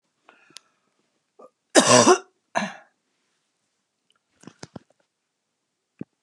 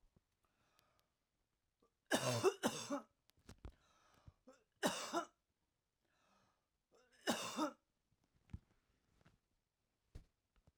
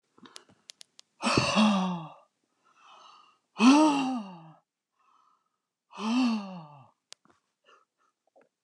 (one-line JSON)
{"cough_length": "6.2 s", "cough_amplitude": 32080, "cough_signal_mean_std_ratio": 0.22, "three_cough_length": "10.8 s", "three_cough_amplitude": 2464, "three_cough_signal_mean_std_ratio": 0.29, "exhalation_length": "8.6 s", "exhalation_amplitude": 13889, "exhalation_signal_mean_std_ratio": 0.37, "survey_phase": "alpha (2021-03-01 to 2021-08-12)", "age": "65+", "gender": "Female", "wearing_mask": "No", "symptom_none": true, "smoker_status": "Never smoked", "respiratory_condition_asthma": false, "respiratory_condition_other": false, "recruitment_source": "REACT", "submission_delay": "2 days", "covid_test_result": "Negative", "covid_test_method": "RT-qPCR"}